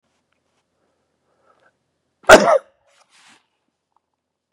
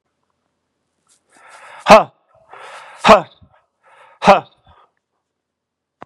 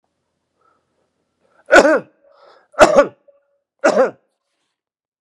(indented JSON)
{
  "cough_length": "4.5 s",
  "cough_amplitude": 32768,
  "cough_signal_mean_std_ratio": 0.18,
  "exhalation_length": "6.1 s",
  "exhalation_amplitude": 32768,
  "exhalation_signal_mean_std_ratio": 0.23,
  "three_cough_length": "5.2 s",
  "three_cough_amplitude": 32768,
  "three_cough_signal_mean_std_ratio": 0.3,
  "survey_phase": "beta (2021-08-13 to 2022-03-07)",
  "age": "65+",
  "gender": "Male",
  "wearing_mask": "No",
  "symptom_none": true,
  "smoker_status": "Never smoked",
  "respiratory_condition_asthma": false,
  "respiratory_condition_other": false,
  "recruitment_source": "REACT",
  "submission_delay": "5 days",
  "covid_test_result": "Negative",
  "covid_test_method": "RT-qPCR",
  "influenza_a_test_result": "Negative",
  "influenza_b_test_result": "Negative"
}